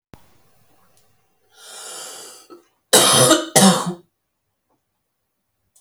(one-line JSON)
{"cough_length": "5.8 s", "cough_amplitude": 32768, "cough_signal_mean_std_ratio": 0.33, "survey_phase": "beta (2021-08-13 to 2022-03-07)", "age": "45-64", "gender": "Female", "wearing_mask": "No", "symptom_cough_any": true, "symptom_new_continuous_cough": true, "symptom_runny_or_blocked_nose": true, "symptom_sore_throat": true, "symptom_fatigue": true, "symptom_headache": true, "smoker_status": "Ex-smoker", "respiratory_condition_asthma": false, "respiratory_condition_other": false, "recruitment_source": "Test and Trace", "submission_delay": "1 day", "covid_test_result": "Positive", "covid_test_method": "LFT"}